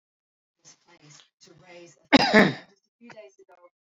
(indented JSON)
{
  "cough_length": "3.9 s",
  "cough_amplitude": 26795,
  "cough_signal_mean_std_ratio": 0.24,
  "survey_phase": "alpha (2021-03-01 to 2021-08-12)",
  "age": "45-64",
  "gender": "Male",
  "wearing_mask": "No",
  "symptom_none": true,
  "smoker_status": "Never smoked",
  "respiratory_condition_asthma": false,
  "respiratory_condition_other": false,
  "recruitment_source": "REACT",
  "submission_delay": "2 days",
  "covid_test_result": "Negative",
  "covid_test_method": "RT-qPCR"
}